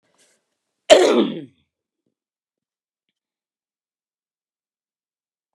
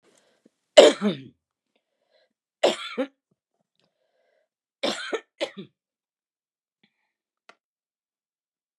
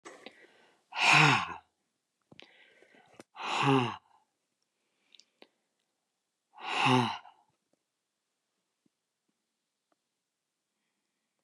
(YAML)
cough_length: 5.5 s
cough_amplitude: 32768
cough_signal_mean_std_ratio: 0.21
three_cough_length: 8.8 s
three_cough_amplitude: 32768
three_cough_signal_mean_std_ratio: 0.19
exhalation_length: 11.4 s
exhalation_amplitude: 11656
exhalation_signal_mean_std_ratio: 0.28
survey_phase: beta (2021-08-13 to 2022-03-07)
age: 65+
gender: Female
wearing_mask: 'No'
symptom_none: true
smoker_status: Never smoked
respiratory_condition_asthma: false
respiratory_condition_other: false
recruitment_source: REACT
submission_delay: 1 day
covid_test_result: Negative
covid_test_method: RT-qPCR
influenza_a_test_result: Negative
influenza_b_test_result: Negative